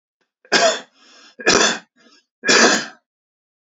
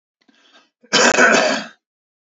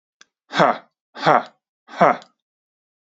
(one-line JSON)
{"three_cough_length": "3.8 s", "three_cough_amplitude": 32767, "three_cough_signal_mean_std_ratio": 0.41, "cough_length": "2.2 s", "cough_amplitude": 30570, "cough_signal_mean_std_ratio": 0.46, "exhalation_length": "3.2 s", "exhalation_amplitude": 32768, "exhalation_signal_mean_std_ratio": 0.31, "survey_phase": "beta (2021-08-13 to 2022-03-07)", "age": "18-44", "gender": "Male", "wearing_mask": "No", "symptom_cough_any": true, "symptom_runny_or_blocked_nose": true, "symptom_onset": "10 days", "smoker_status": "Never smoked", "respiratory_condition_asthma": true, "respiratory_condition_other": false, "recruitment_source": "REACT", "submission_delay": "0 days", "covid_test_result": "Negative", "covid_test_method": "RT-qPCR", "influenza_a_test_result": "Negative", "influenza_b_test_result": "Negative"}